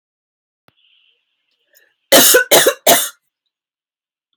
{"cough_length": "4.4 s", "cough_amplitude": 32768, "cough_signal_mean_std_ratio": 0.33, "survey_phase": "alpha (2021-03-01 to 2021-08-12)", "age": "45-64", "gender": "Female", "wearing_mask": "No", "symptom_none": true, "smoker_status": "Never smoked", "respiratory_condition_asthma": true, "respiratory_condition_other": false, "recruitment_source": "REACT", "submission_delay": "1 day", "covid_test_result": "Negative", "covid_test_method": "RT-qPCR"}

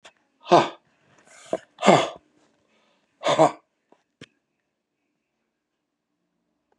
{"exhalation_length": "6.8 s", "exhalation_amplitude": 30563, "exhalation_signal_mean_std_ratio": 0.24, "survey_phase": "beta (2021-08-13 to 2022-03-07)", "age": "65+", "gender": "Male", "wearing_mask": "No", "symptom_cough_any": true, "symptom_runny_or_blocked_nose": true, "symptom_abdominal_pain": true, "symptom_fatigue": true, "symptom_headache": true, "symptom_onset": "6 days", "smoker_status": "Ex-smoker", "respiratory_condition_asthma": false, "respiratory_condition_other": false, "recruitment_source": "REACT", "submission_delay": "1 day", "covid_test_result": "Negative", "covid_test_method": "RT-qPCR", "influenza_a_test_result": "Negative", "influenza_b_test_result": "Negative"}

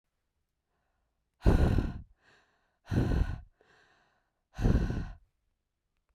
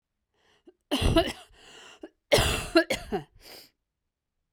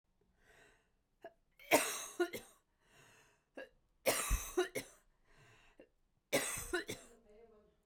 {"exhalation_length": "6.1 s", "exhalation_amplitude": 11536, "exhalation_signal_mean_std_ratio": 0.37, "cough_length": "4.5 s", "cough_amplitude": 16141, "cough_signal_mean_std_ratio": 0.37, "three_cough_length": "7.9 s", "three_cough_amplitude": 5834, "three_cough_signal_mean_std_ratio": 0.35, "survey_phase": "beta (2021-08-13 to 2022-03-07)", "age": "18-44", "gender": "Female", "wearing_mask": "No", "symptom_cough_any": true, "symptom_new_continuous_cough": true, "symptom_runny_or_blocked_nose": true, "symptom_sore_throat": true, "symptom_fatigue": true, "symptom_headache": true, "symptom_onset": "8 days", "smoker_status": "Never smoked", "respiratory_condition_asthma": false, "respiratory_condition_other": false, "recruitment_source": "Test and Trace", "submission_delay": "2 days", "covid_test_result": "Positive", "covid_test_method": "RT-qPCR", "covid_ct_value": 33.4, "covid_ct_gene": "N gene", "covid_ct_mean": 35.4, "covid_viral_load": "2.5 copies/ml", "covid_viral_load_category": "Minimal viral load (< 10K copies/ml)"}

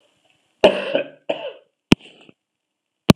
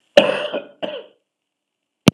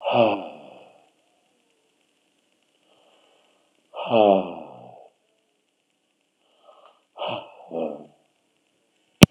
{"three_cough_length": "3.2 s", "three_cough_amplitude": 32768, "three_cough_signal_mean_std_ratio": 0.24, "cough_length": "2.1 s", "cough_amplitude": 32768, "cough_signal_mean_std_ratio": 0.29, "exhalation_length": "9.3 s", "exhalation_amplitude": 32768, "exhalation_signal_mean_std_ratio": 0.24, "survey_phase": "beta (2021-08-13 to 2022-03-07)", "age": "65+", "gender": "Male", "wearing_mask": "No", "symptom_fatigue": true, "smoker_status": "Ex-smoker", "respiratory_condition_asthma": true, "respiratory_condition_other": false, "recruitment_source": "REACT", "submission_delay": "2 days", "covid_test_result": "Negative", "covid_test_method": "RT-qPCR", "influenza_a_test_result": "Negative", "influenza_b_test_result": "Negative"}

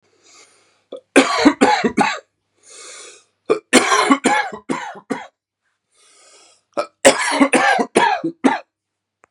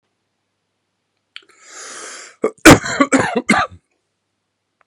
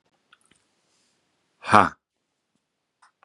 {"three_cough_length": "9.3 s", "three_cough_amplitude": 32768, "three_cough_signal_mean_std_ratio": 0.45, "cough_length": "4.9 s", "cough_amplitude": 32768, "cough_signal_mean_std_ratio": 0.29, "exhalation_length": "3.2 s", "exhalation_amplitude": 32767, "exhalation_signal_mean_std_ratio": 0.16, "survey_phase": "beta (2021-08-13 to 2022-03-07)", "age": "18-44", "gender": "Male", "wearing_mask": "No", "symptom_headache": true, "symptom_onset": "12 days", "smoker_status": "Ex-smoker", "respiratory_condition_asthma": false, "respiratory_condition_other": false, "recruitment_source": "REACT", "submission_delay": "1 day", "covid_test_result": "Negative", "covid_test_method": "RT-qPCR", "influenza_a_test_result": "Negative", "influenza_b_test_result": "Negative"}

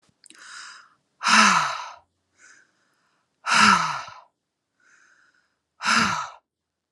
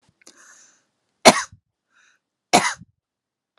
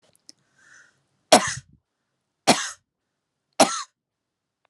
{"exhalation_length": "6.9 s", "exhalation_amplitude": 26146, "exhalation_signal_mean_std_ratio": 0.37, "cough_length": "3.6 s", "cough_amplitude": 32768, "cough_signal_mean_std_ratio": 0.2, "three_cough_length": "4.7 s", "three_cough_amplitude": 32751, "three_cough_signal_mean_std_ratio": 0.22, "survey_phase": "alpha (2021-03-01 to 2021-08-12)", "age": "45-64", "gender": "Female", "wearing_mask": "No", "symptom_none": true, "smoker_status": "Ex-smoker", "respiratory_condition_asthma": false, "respiratory_condition_other": false, "recruitment_source": "REACT", "submission_delay": "1 day", "covid_test_result": "Negative", "covid_test_method": "RT-qPCR"}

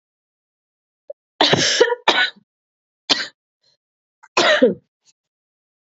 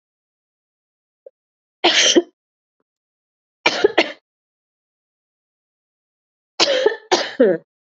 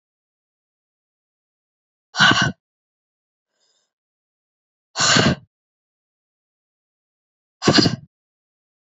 {"cough_length": "5.8 s", "cough_amplitude": 31037, "cough_signal_mean_std_ratio": 0.36, "three_cough_length": "7.9 s", "three_cough_amplitude": 32767, "three_cough_signal_mean_std_ratio": 0.31, "exhalation_length": "9.0 s", "exhalation_amplitude": 32305, "exhalation_signal_mean_std_ratio": 0.26, "survey_phase": "beta (2021-08-13 to 2022-03-07)", "age": "18-44", "gender": "Female", "wearing_mask": "No", "symptom_cough_any": true, "symptom_runny_or_blocked_nose": true, "symptom_other": true, "symptom_onset": "2 days", "smoker_status": "Ex-smoker", "respiratory_condition_asthma": false, "respiratory_condition_other": false, "recruitment_source": "Test and Trace", "submission_delay": "2 days", "covid_test_result": "Positive", "covid_test_method": "RT-qPCR", "covid_ct_value": 19.7, "covid_ct_gene": "ORF1ab gene", "covid_ct_mean": 19.8, "covid_viral_load": "320000 copies/ml", "covid_viral_load_category": "Low viral load (10K-1M copies/ml)"}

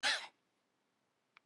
{"cough_length": "1.5 s", "cough_amplitude": 3013, "cough_signal_mean_std_ratio": 0.29, "survey_phase": "beta (2021-08-13 to 2022-03-07)", "age": "65+", "gender": "Female", "wearing_mask": "No", "symptom_none": true, "smoker_status": "Ex-smoker", "respiratory_condition_asthma": false, "respiratory_condition_other": false, "recruitment_source": "REACT", "submission_delay": "2 days", "covid_test_result": "Negative", "covid_test_method": "RT-qPCR", "influenza_a_test_result": "Negative", "influenza_b_test_result": "Negative"}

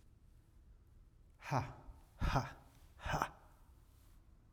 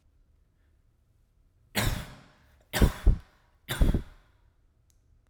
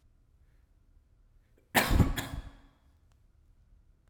{"exhalation_length": "4.5 s", "exhalation_amplitude": 4480, "exhalation_signal_mean_std_ratio": 0.41, "three_cough_length": "5.3 s", "three_cough_amplitude": 14924, "three_cough_signal_mean_std_ratio": 0.3, "cough_length": "4.1 s", "cough_amplitude": 13594, "cough_signal_mean_std_ratio": 0.29, "survey_phase": "alpha (2021-03-01 to 2021-08-12)", "age": "18-44", "gender": "Male", "wearing_mask": "No", "symptom_diarrhoea": true, "smoker_status": "Ex-smoker", "respiratory_condition_asthma": false, "respiratory_condition_other": false, "recruitment_source": "REACT", "submission_delay": "1 day", "covid_test_result": "Negative", "covid_test_method": "RT-qPCR"}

